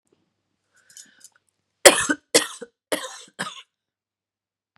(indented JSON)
{
  "three_cough_length": "4.8 s",
  "three_cough_amplitude": 32768,
  "three_cough_signal_mean_std_ratio": 0.21,
  "survey_phase": "beta (2021-08-13 to 2022-03-07)",
  "age": "45-64",
  "gender": "Female",
  "wearing_mask": "No",
  "symptom_cough_any": true,
  "symptom_runny_or_blocked_nose": true,
  "symptom_sore_throat": true,
  "smoker_status": "Never smoked",
  "respiratory_condition_asthma": false,
  "respiratory_condition_other": false,
  "recruitment_source": "Test and Trace",
  "submission_delay": "1 day",
  "covid_test_result": "Positive",
  "covid_test_method": "LFT"
}